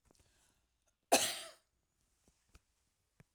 {"three_cough_length": "3.3 s", "three_cough_amplitude": 6549, "three_cough_signal_mean_std_ratio": 0.2, "survey_phase": "alpha (2021-03-01 to 2021-08-12)", "age": "65+", "gender": "Female", "wearing_mask": "No", "symptom_none": true, "smoker_status": "Ex-smoker", "respiratory_condition_asthma": false, "respiratory_condition_other": false, "recruitment_source": "REACT", "submission_delay": "1 day", "covid_test_result": "Negative", "covid_test_method": "RT-qPCR"}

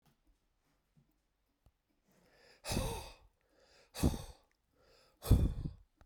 {"exhalation_length": "6.1 s", "exhalation_amplitude": 7363, "exhalation_signal_mean_std_ratio": 0.28, "survey_phase": "beta (2021-08-13 to 2022-03-07)", "age": "45-64", "gender": "Male", "wearing_mask": "No", "symptom_cough_any": true, "symptom_runny_or_blocked_nose": true, "symptom_fatigue": true, "symptom_change_to_sense_of_smell_or_taste": true, "symptom_onset": "7 days", "smoker_status": "Ex-smoker", "respiratory_condition_asthma": false, "respiratory_condition_other": false, "recruitment_source": "Test and Trace", "submission_delay": "1 day", "covid_test_result": "Positive", "covid_test_method": "RT-qPCR", "covid_ct_value": 23.6, "covid_ct_gene": "N gene", "covid_ct_mean": 24.3, "covid_viral_load": "11000 copies/ml", "covid_viral_load_category": "Low viral load (10K-1M copies/ml)"}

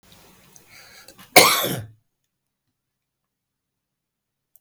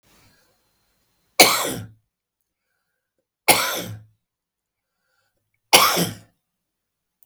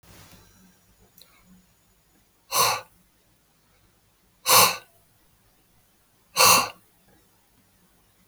{"cough_length": "4.6 s", "cough_amplitude": 32768, "cough_signal_mean_std_ratio": 0.21, "three_cough_length": "7.3 s", "three_cough_amplitude": 32768, "three_cough_signal_mean_std_ratio": 0.27, "exhalation_length": "8.3 s", "exhalation_amplitude": 24036, "exhalation_signal_mean_std_ratio": 0.26, "survey_phase": "beta (2021-08-13 to 2022-03-07)", "age": "45-64", "gender": "Male", "wearing_mask": "No", "symptom_cough_any": true, "symptom_runny_or_blocked_nose": true, "symptom_shortness_of_breath": true, "smoker_status": "Current smoker (11 or more cigarettes per day)", "respiratory_condition_asthma": false, "respiratory_condition_other": true, "recruitment_source": "REACT", "submission_delay": "2 days", "covid_test_result": "Negative", "covid_test_method": "RT-qPCR"}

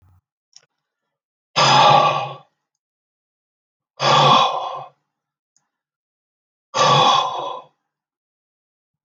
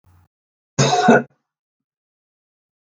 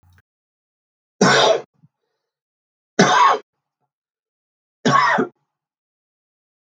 {"exhalation_length": "9.0 s", "exhalation_amplitude": 30687, "exhalation_signal_mean_std_ratio": 0.39, "cough_length": "2.8 s", "cough_amplitude": 32276, "cough_signal_mean_std_ratio": 0.31, "three_cough_length": "6.7 s", "three_cough_amplitude": 32766, "three_cough_signal_mean_std_ratio": 0.35, "survey_phase": "beta (2021-08-13 to 2022-03-07)", "age": "65+", "gender": "Male", "wearing_mask": "No", "symptom_runny_or_blocked_nose": true, "symptom_sore_throat": true, "symptom_onset": "5 days", "smoker_status": "Ex-smoker", "respiratory_condition_asthma": false, "respiratory_condition_other": false, "recruitment_source": "REACT", "submission_delay": "2 days", "covid_test_result": "Negative", "covid_test_method": "RT-qPCR", "influenza_a_test_result": "Negative", "influenza_b_test_result": "Negative"}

